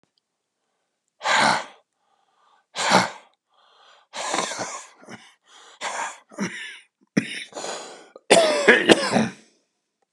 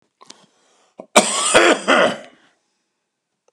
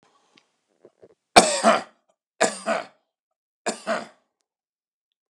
{
  "exhalation_length": "10.1 s",
  "exhalation_amplitude": 32768,
  "exhalation_signal_mean_std_ratio": 0.38,
  "cough_length": "3.5 s",
  "cough_amplitude": 32768,
  "cough_signal_mean_std_ratio": 0.38,
  "three_cough_length": "5.3 s",
  "three_cough_amplitude": 32768,
  "three_cough_signal_mean_std_ratio": 0.27,
  "survey_phase": "alpha (2021-03-01 to 2021-08-12)",
  "age": "65+",
  "gender": "Male",
  "wearing_mask": "No",
  "symptom_none": true,
  "smoker_status": "Ex-smoker",
  "respiratory_condition_asthma": true,
  "respiratory_condition_other": true,
  "recruitment_source": "REACT",
  "submission_delay": "5 days",
  "covid_test_result": "Negative",
  "covid_test_method": "RT-qPCR"
}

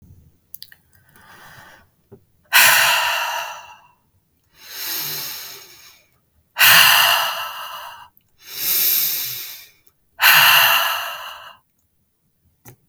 {
  "exhalation_length": "12.9 s",
  "exhalation_amplitude": 32768,
  "exhalation_signal_mean_std_ratio": 0.45,
  "survey_phase": "beta (2021-08-13 to 2022-03-07)",
  "age": "18-44",
  "gender": "Male",
  "wearing_mask": "No",
  "symptom_none": true,
  "smoker_status": "Never smoked",
  "respiratory_condition_asthma": false,
  "respiratory_condition_other": false,
  "recruitment_source": "REACT",
  "submission_delay": "1 day",
  "covid_test_result": "Negative",
  "covid_test_method": "RT-qPCR",
  "influenza_a_test_result": "Negative",
  "influenza_b_test_result": "Negative"
}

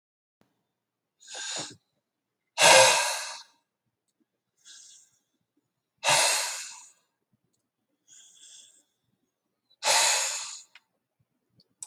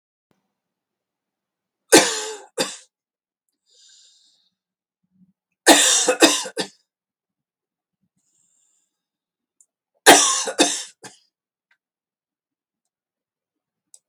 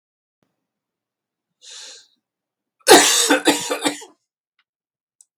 {
  "exhalation_length": "11.9 s",
  "exhalation_amplitude": 21203,
  "exhalation_signal_mean_std_ratio": 0.3,
  "three_cough_length": "14.1 s",
  "three_cough_amplitude": 32768,
  "three_cough_signal_mean_std_ratio": 0.25,
  "cough_length": "5.4 s",
  "cough_amplitude": 32768,
  "cough_signal_mean_std_ratio": 0.3,
  "survey_phase": "beta (2021-08-13 to 2022-03-07)",
  "age": "45-64",
  "gender": "Male",
  "wearing_mask": "No",
  "symptom_none": true,
  "smoker_status": "Never smoked",
  "respiratory_condition_asthma": false,
  "respiratory_condition_other": false,
  "recruitment_source": "REACT",
  "submission_delay": "1 day",
  "covid_test_result": "Negative",
  "covid_test_method": "RT-qPCR",
  "influenza_a_test_result": "Negative",
  "influenza_b_test_result": "Negative"
}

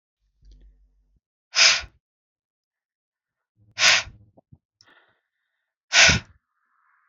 {
  "exhalation_length": "7.1 s",
  "exhalation_amplitude": 26265,
  "exhalation_signal_mean_std_ratio": 0.25,
  "survey_phase": "beta (2021-08-13 to 2022-03-07)",
  "age": "18-44",
  "gender": "Male",
  "wearing_mask": "No",
  "symptom_none": true,
  "smoker_status": "Never smoked",
  "respiratory_condition_asthma": false,
  "respiratory_condition_other": false,
  "recruitment_source": "REACT",
  "submission_delay": "1 day",
  "covid_test_result": "Negative",
  "covid_test_method": "RT-qPCR",
  "influenza_a_test_result": "Negative",
  "influenza_b_test_result": "Negative"
}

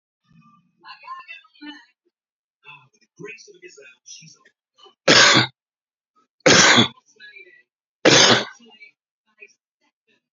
{
  "three_cough_length": "10.3 s",
  "three_cough_amplitude": 32767,
  "three_cough_signal_mean_std_ratio": 0.29,
  "survey_phase": "beta (2021-08-13 to 2022-03-07)",
  "age": "45-64",
  "gender": "Male",
  "wearing_mask": "No",
  "symptom_none": true,
  "smoker_status": "Current smoker (e-cigarettes or vapes only)",
  "respiratory_condition_asthma": true,
  "respiratory_condition_other": true,
  "recruitment_source": "REACT",
  "submission_delay": "1 day",
  "covid_test_result": "Negative",
  "covid_test_method": "RT-qPCR"
}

